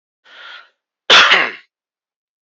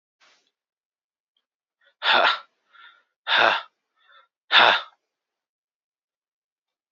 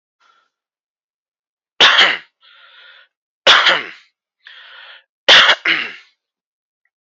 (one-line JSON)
{"cough_length": "2.6 s", "cough_amplitude": 31125, "cough_signal_mean_std_ratio": 0.33, "exhalation_length": "6.9 s", "exhalation_amplitude": 27014, "exhalation_signal_mean_std_ratio": 0.28, "three_cough_length": "7.1 s", "three_cough_amplitude": 31978, "three_cough_signal_mean_std_ratio": 0.33, "survey_phase": "beta (2021-08-13 to 2022-03-07)", "age": "18-44", "gender": "Male", "wearing_mask": "No", "symptom_abdominal_pain": true, "smoker_status": "Ex-smoker", "respiratory_condition_asthma": false, "respiratory_condition_other": false, "recruitment_source": "REACT", "submission_delay": "1 day", "covid_test_result": "Negative", "covid_test_method": "RT-qPCR", "influenza_a_test_result": "Negative", "influenza_b_test_result": "Negative"}